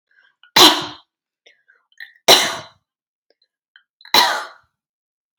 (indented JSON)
{
  "three_cough_length": "5.4 s",
  "three_cough_amplitude": 32768,
  "three_cough_signal_mean_std_ratio": 0.28,
  "survey_phase": "beta (2021-08-13 to 2022-03-07)",
  "age": "18-44",
  "gender": "Female",
  "wearing_mask": "No",
  "symptom_none": true,
  "smoker_status": "Never smoked",
  "respiratory_condition_asthma": false,
  "respiratory_condition_other": false,
  "recruitment_source": "REACT",
  "submission_delay": "2 days",
  "covid_test_result": "Negative",
  "covid_test_method": "RT-qPCR",
  "influenza_a_test_result": "Negative",
  "influenza_b_test_result": "Negative"
}